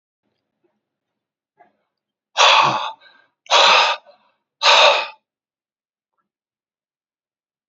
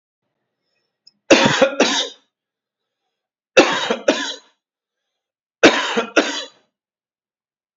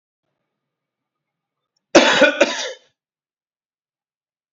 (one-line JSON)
{"exhalation_length": "7.7 s", "exhalation_amplitude": 32693, "exhalation_signal_mean_std_ratio": 0.34, "three_cough_length": "7.8 s", "three_cough_amplitude": 32767, "three_cough_signal_mean_std_ratio": 0.35, "cough_length": "4.5 s", "cough_amplitude": 28799, "cough_signal_mean_std_ratio": 0.27, "survey_phase": "beta (2021-08-13 to 2022-03-07)", "age": "45-64", "gender": "Male", "wearing_mask": "No", "symptom_cough_any": true, "symptom_runny_or_blocked_nose": true, "symptom_shortness_of_breath": true, "symptom_fatigue": true, "symptom_fever_high_temperature": true, "symptom_headache": true, "symptom_change_to_sense_of_smell_or_taste": true, "symptom_loss_of_taste": true, "smoker_status": "Never smoked", "respiratory_condition_asthma": false, "respiratory_condition_other": false, "recruitment_source": "Test and Trace", "submission_delay": "2 days", "covid_test_result": "Positive", "covid_test_method": "LFT"}